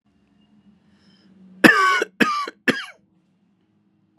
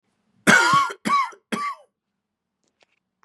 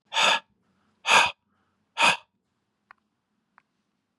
{"cough_length": "4.2 s", "cough_amplitude": 32768, "cough_signal_mean_std_ratio": 0.32, "three_cough_length": "3.2 s", "three_cough_amplitude": 29714, "three_cough_signal_mean_std_ratio": 0.41, "exhalation_length": "4.2 s", "exhalation_amplitude": 21364, "exhalation_signal_mean_std_ratio": 0.31, "survey_phase": "beta (2021-08-13 to 2022-03-07)", "age": "45-64", "gender": "Male", "wearing_mask": "No", "symptom_sore_throat": true, "symptom_diarrhoea": true, "smoker_status": "Never smoked", "respiratory_condition_asthma": false, "respiratory_condition_other": false, "recruitment_source": "Test and Trace", "submission_delay": "1 day", "covid_test_result": "Positive", "covid_test_method": "RT-qPCR", "covid_ct_value": 27.9, "covid_ct_gene": "N gene"}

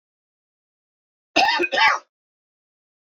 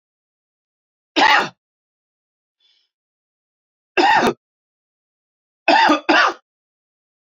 {"cough_length": "3.2 s", "cough_amplitude": 23040, "cough_signal_mean_std_ratio": 0.34, "three_cough_length": "7.3 s", "three_cough_amplitude": 27690, "three_cough_signal_mean_std_ratio": 0.33, "survey_phase": "beta (2021-08-13 to 2022-03-07)", "age": "45-64", "gender": "Male", "wearing_mask": "No", "symptom_none": true, "smoker_status": "Ex-smoker", "respiratory_condition_asthma": false, "respiratory_condition_other": false, "recruitment_source": "REACT", "submission_delay": "6 days", "covid_test_result": "Negative", "covid_test_method": "RT-qPCR"}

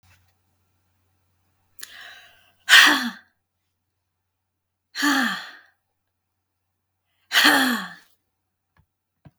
{"exhalation_length": "9.4 s", "exhalation_amplitude": 32768, "exhalation_signal_mean_std_ratio": 0.28, "survey_phase": "beta (2021-08-13 to 2022-03-07)", "age": "45-64", "gender": "Female", "wearing_mask": "No", "symptom_none": true, "smoker_status": "Never smoked", "respiratory_condition_asthma": true, "respiratory_condition_other": false, "recruitment_source": "REACT", "submission_delay": "1 day", "covid_test_result": "Negative", "covid_test_method": "RT-qPCR"}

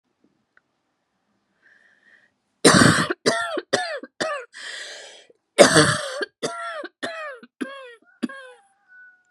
{"cough_length": "9.3 s", "cough_amplitude": 32768, "cough_signal_mean_std_ratio": 0.35, "survey_phase": "beta (2021-08-13 to 2022-03-07)", "age": "45-64", "gender": "Female", "wearing_mask": "No", "symptom_cough_any": true, "symptom_shortness_of_breath": true, "symptom_sore_throat": true, "symptom_fatigue": true, "symptom_headache": true, "symptom_other": true, "smoker_status": "Never smoked", "respiratory_condition_asthma": false, "respiratory_condition_other": false, "recruitment_source": "Test and Trace", "submission_delay": "2 days", "covid_test_result": "Positive", "covid_test_method": "RT-qPCR", "covid_ct_value": 23.6, "covid_ct_gene": "ORF1ab gene", "covid_ct_mean": 24.2, "covid_viral_load": "12000 copies/ml", "covid_viral_load_category": "Low viral load (10K-1M copies/ml)"}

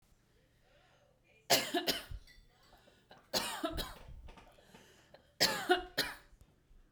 {"three_cough_length": "6.9 s", "three_cough_amplitude": 6779, "three_cough_signal_mean_std_ratio": 0.38, "survey_phase": "beta (2021-08-13 to 2022-03-07)", "age": "18-44", "gender": "Female", "wearing_mask": "No", "symptom_none": true, "smoker_status": "Ex-smoker", "respiratory_condition_asthma": false, "respiratory_condition_other": false, "recruitment_source": "REACT", "submission_delay": "1 day", "covid_test_result": "Negative", "covid_test_method": "RT-qPCR"}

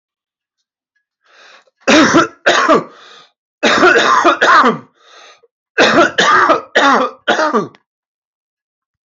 {"cough_length": "9.0 s", "cough_amplitude": 32683, "cough_signal_mean_std_ratio": 0.53, "survey_phase": "alpha (2021-03-01 to 2021-08-12)", "age": "45-64", "gender": "Male", "wearing_mask": "No", "symptom_cough_any": true, "symptom_new_continuous_cough": true, "symptom_fatigue": true, "symptom_fever_high_temperature": true, "symptom_headache": true, "symptom_change_to_sense_of_smell_or_taste": true, "symptom_onset": "4 days", "smoker_status": "Ex-smoker", "respiratory_condition_asthma": false, "respiratory_condition_other": false, "recruitment_source": "Test and Trace", "submission_delay": "1 day", "covid_test_result": "Positive", "covid_test_method": "RT-qPCR", "covid_ct_value": 14.9, "covid_ct_gene": "ORF1ab gene", "covid_ct_mean": 15.2, "covid_viral_load": "10000000 copies/ml", "covid_viral_load_category": "High viral load (>1M copies/ml)"}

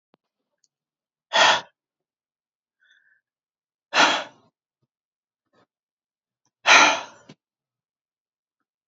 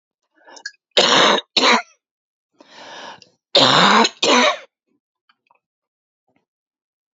{"exhalation_length": "8.9 s", "exhalation_amplitude": 28127, "exhalation_signal_mean_std_ratio": 0.24, "cough_length": "7.2 s", "cough_amplitude": 30793, "cough_signal_mean_std_ratio": 0.39, "survey_phase": "alpha (2021-03-01 to 2021-08-12)", "age": "45-64", "gender": "Female", "wearing_mask": "No", "symptom_cough_any": true, "symptom_shortness_of_breath": true, "symptom_abdominal_pain": true, "symptom_fatigue": true, "symptom_fever_high_temperature": true, "symptom_headache": true, "symptom_onset": "3 days", "smoker_status": "Never smoked", "respiratory_condition_asthma": false, "respiratory_condition_other": false, "recruitment_source": "Test and Trace", "submission_delay": "2 days", "covid_test_result": "Positive", "covid_test_method": "RT-qPCR", "covid_ct_value": 14.2, "covid_ct_gene": "N gene", "covid_ct_mean": 14.6, "covid_viral_load": "17000000 copies/ml", "covid_viral_load_category": "High viral load (>1M copies/ml)"}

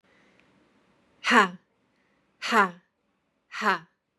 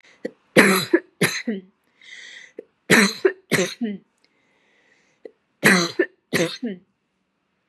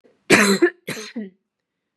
{"exhalation_length": "4.2 s", "exhalation_amplitude": 22038, "exhalation_signal_mean_std_ratio": 0.29, "three_cough_length": "7.7 s", "three_cough_amplitude": 32767, "three_cough_signal_mean_std_ratio": 0.37, "cough_length": "2.0 s", "cough_amplitude": 32767, "cough_signal_mean_std_ratio": 0.4, "survey_phase": "beta (2021-08-13 to 2022-03-07)", "age": "18-44", "gender": "Female", "wearing_mask": "No", "symptom_none": true, "smoker_status": "Never smoked", "respiratory_condition_asthma": false, "respiratory_condition_other": false, "recruitment_source": "REACT", "submission_delay": "1 day", "covid_test_result": "Negative", "covid_test_method": "RT-qPCR", "influenza_a_test_result": "Negative", "influenza_b_test_result": "Negative"}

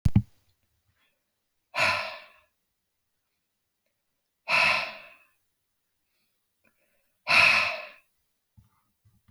{"exhalation_length": "9.3 s", "exhalation_amplitude": 17498, "exhalation_signal_mean_std_ratio": 0.3, "survey_phase": "alpha (2021-03-01 to 2021-08-12)", "age": "45-64", "gender": "Male", "wearing_mask": "No", "symptom_none": true, "symptom_onset": "7 days", "smoker_status": "Never smoked", "respiratory_condition_asthma": false, "respiratory_condition_other": false, "recruitment_source": "REACT", "submission_delay": "2 days", "covid_test_result": "Negative", "covid_test_method": "RT-qPCR"}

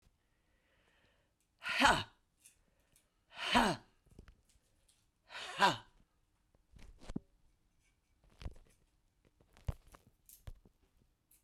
{"exhalation_length": "11.4 s", "exhalation_amplitude": 7213, "exhalation_signal_mean_std_ratio": 0.25, "survey_phase": "beta (2021-08-13 to 2022-03-07)", "age": "65+", "gender": "Female", "wearing_mask": "No", "symptom_cough_any": true, "symptom_sore_throat": true, "symptom_fatigue": true, "symptom_headache": true, "symptom_change_to_sense_of_smell_or_taste": true, "symptom_loss_of_taste": true, "symptom_onset": "4 days", "smoker_status": "Ex-smoker", "respiratory_condition_asthma": false, "respiratory_condition_other": true, "recruitment_source": "Test and Trace", "submission_delay": "2 days", "covid_test_result": "Positive", "covid_test_method": "RT-qPCR", "covid_ct_value": 35.7, "covid_ct_gene": "ORF1ab gene"}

